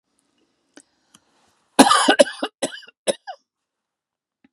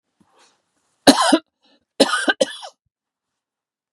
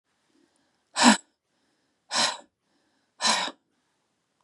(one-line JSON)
{"cough_length": "4.5 s", "cough_amplitude": 32768, "cough_signal_mean_std_ratio": 0.26, "three_cough_length": "3.9 s", "three_cough_amplitude": 32768, "three_cough_signal_mean_std_ratio": 0.29, "exhalation_length": "4.4 s", "exhalation_amplitude": 23319, "exhalation_signal_mean_std_ratio": 0.28, "survey_phase": "beta (2021-08-13 to 2022-03-07)", "age": "45-64", "gender": "Female", "wearing_mask": "No", "symptom_none": true, "smoker_status": "Never smoked", "respiratory_condition_asthma": false, "respiratory_condition_other": false, "recruitment_source": "REACT", "submission_delay": "2 days", "covid_test_result": "Negative", "covid_test_method": "RT-qPCR", "influenza_a_test_result": "Negative", "influenza_b_test_result": "Negative"}